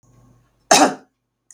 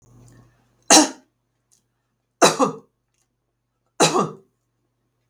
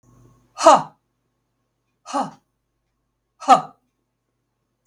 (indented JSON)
{
  "cough_length": "1.5 s",
  "cough_amplitude": 32768,
  "cough_signal_mean_std_ratio": 0.3,
  "three_cough_length": "5.3 s",
  "three_cough_amplitude": 32768,
  "three_cough_signal_mean_std_ratio": 0.27,
  "exhalation_length": "4.9 s",
  "exhalation_amplitude": 32768,
  "exhalation_signal_mean_std_ratio": 0.22,
  "survey_phase": "beta (2021-08-13 to 2022-03-07)",
  "age": "65+",
  "gender": "Female",
  "wearing_mask": "No",
  "symptom_none": true,
  "symptom_onset": "3 days",
  "smoker_status": "Ex-smoker",
  "respiratory_condition_asthma": false,
  "respiratory_condition_other": false,
  "recruitment_source": "REACT",
  "submission_delay": "1 day",
  "covid_test_result": "Negative",
  "covid_test_method": "RT-qPCR",
  "influenza_a_test_result": "Negative",
  "influenza_b_test_result": "Negative"
}